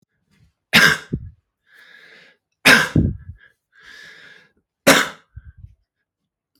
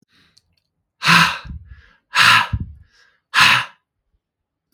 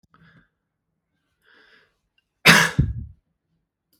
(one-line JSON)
{"three_cough_length": "6.6 s", "three_cough_amplitude": 32768, "three_cough_signal_mean_std_ratio": 0.3, "exhalation_length": "4.7 s", "exhalation_amplitude": 32768, "exhalation_signal_mean_std_ratio": 0.38, "cough_length": "4.0 s", "cough_amplitude": 32767, "cough_signal_mean_std_ratio": 0.24, "survey_phase": "beta (2021-08-13 to 2022-03-07)", "age": "18-44", "gender": "Male", "wearing_mask": "No", "symptom_none": true, "smoker_status": "Ex-smoker", "respiratory_condition_asthma": false, "respiratory_condition_other": false, "recruitment_source": "REACT", "submission_delay": "1 day", "covid_test_result": "Negative", "covid_test_method": "RT-qPCR", "influenza_a_test_result": "Negative", "influenza_b_test_result": "Negative"}